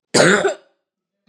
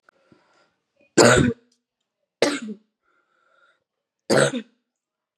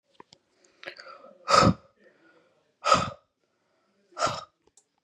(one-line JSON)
{"cough_length": "1.3 s", "cough_amplitude": 31423, "cough_signal_mean_std_ratio": 0.44, "three_cough_length": "5.4 s", "three_cough_amplitude": 32767, "three_cough_signal_mean_std_ratio": 0.3, "exhalation_length": "5.0 s", "exhalation_amplitude": 18706, "exhalation_signal_mean_std_ratio": 0.28, "survey_phase": "beta (2021-08-13 to 2022-03-07)", "age": "18-44", "gender": "Female", "wearing_mask": "No", "symptom_cough_any": true, "symptom_runny_or_blocked_nose": true, "symptom_sore_throat": true, "symptom_fatigue": true, "symptom_headache": true, "smoker_status": "Current smoker (1 to 10 cigarettes per day)", "respiratory_condition_asthma": false, "respiratory_condition_other": false, "recruitment_source": "Test and Trace", "submission_delay": "2 days", "covid_test_result": "Positive", "covid_test_method": "RT-qPCR"}